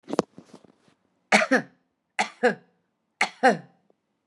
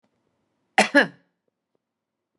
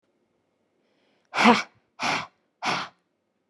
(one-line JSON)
{"three_cough_length": "4.3 s", "three_cough_amplitude": 24952, "three_cough_signal_mean_std_ratio": 0.31, "cough_length": "2.4 s", "cough_amplitude": 22758, "cough_signal_mean_std_ratio": 0.22, "exhalation_length": "3.5 s", "exhalation_amplitude": 27416, "exhalation_signal_mean_std_ratio": 0.31, "survey_phase": "beta (2021-08-13 to 2022-03-07)", "age": "18-44", "gender": "Female", "wearing_mask": "No", "symptom_none": true, "symptom_onset": "13 days", "smoker_status": "Current smoker (11 or more cigarettes per day)", "respiratory_condition_asthma": false, "respiratory_condition_other": false, "recruitment_source": "REACT", "submission_delay": "2 days", "covid_test_result": "Negative", "covid_test_method": "RT-qPCR", "influenza_a_test_result": "Negative", "influenza_b_test_result": "Negative"}